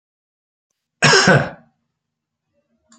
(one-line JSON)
{"cough_length": "3.0 s", "cough_amplitude": 31123, "cough_signal_mean_std_ratio": 0.31, "survey_phase": "alpha (2021-03-01 to 2021-08-12)", "age": "45-64", "gender": "Male", "wearing_mask": "No", "symptom_none": true, "smoker_status": "Never smoked", "respiratory_condition_asthma": false, "respiratory_condition_other": false, "recruitment_source": "REACT", "submission_delay": "1 day", "covid_test_result": "Negative", "covid_test_method": "RT-qPCR"}